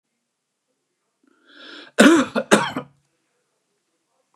{"cough_length": "4.4 s", "cough_amplitude": 29204, "cough_signal_mean_std_ratio": 0.28, "survey_phase": "beta (2021-08-13 to 2022-03-07)", "age": "45-64", "gender": "Male", "wearing_mask": "No", "symptom_none": true, "smoker_status": "Ex-smoker", "respiratory_condition_asthma": true, "respiratory_condition_other": false, "recruitment_source": "REACT", "submission_delay": "5 days", "covid_test_result": "Negative", "covid_test_method": "RT-qPCR", "influenza_a_test_result": "Negative", "influenza_b_test_result": "Negative"}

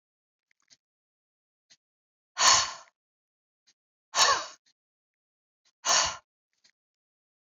{"exhalation_length": "7.4 s", "exhalation_amplitude": 18725, "exhalation_signal_mean_std_ratio": 0.26, "survey_phase": "beta (2021-08-13 to 2022-03-07)", "age": "65+", "gender": "Female", "wearing_mask": "No", "symptom_shortness_of_breath": true, "smoker_status": "Never smoked", "respiratory_condition_asthma": false, "respiratory_condition_other": false, "recruitment_source": "REACT", "submission_delay": "1 day", "covid_test_result": "Negative", "covid_test_method": "RT-qPCR"}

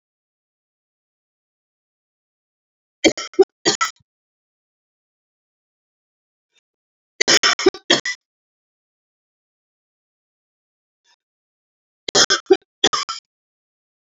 {"three_cough_length": "14.2 s", "three_cough_amplitude": 31727, "three_cough_signal_mean_std_ratio": 0.21, "survey_phase": "beta (2021-08-13 to 2022-03-07)", "age": "45-64", "gender": "Female", "wearing_mask": "No", "symptom_cough_any": true, "symptom_runny_or_blocked_nose": true, "symptom_onset": "12 days", "smoker_status": "Ex-smoker", "respiratory_condition_asthma": false, "respiratory_condition_other": true, "recruitment_source": "REACT", "submission_delay": "1 day", "covid_test_result": "Negative", "covid_test_method": "RT-qPCR"}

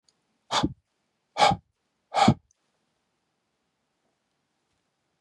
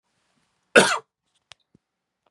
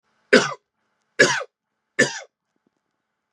{"exhalation_length": "5.2 s", "exhalation_amplitude": 16806, "exhalation_signal_mean_std_ratio": 0.24, "cough_length": "2.3 s", "cough_amplitude": 32566, "cough_signal_mean_std_ratio": 0.21, "three_cough_length": "3.3 s", "three_cough_amplitude": 31518, "three_cough_signal_mean_std_ratio": 0.28, "survey_phase": "beta (2021-08-13 to 2022-03-07)", "age": "45-64", "gender": "Male", "wearing_mask": "No", "symptom_none": true, "symptom_onset": "12 days", "smoker_status": "Ex-smoker", "respiratory_condition_asthma": false, "respiratory_condition_other": false, "recruitment_source": "REACT", "submission_delay": "4 days", "covid_test_result": "Negative", "covid_test_method": "RT-qPCR", "influenza_a_test_result": "Negative", "influenza_b_test_result": "Negative"}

